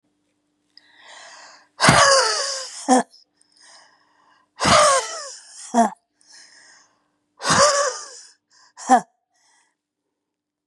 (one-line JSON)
{"exhalation_length": "10.7 s", "exhalation_amplitude": 32682, "exhalation_signal_mean_std_ratio": 0.38, "survey_phase": "beta (2021-08-13 to 2022-03-07)", "age": "45-64", "gender": "Female", "wearing_mask": "No", "symptom_shortness_of_breath": true, "symptom_fatigue": true, "symptom_headache": true, "symptom_onset": "12 days", "smoker_status": "Ex-smoker", "respiratory_condition_asthma": false, "respiratory_condition_other": true, "recruitment_source": "REACT", "submission_delay": "1 day", "covid_test_result": "Negative", "covid_test_method": "RT-qPCR", "influenza_a_test_result": "Negative", "influenza_b_test_result": "Negative"}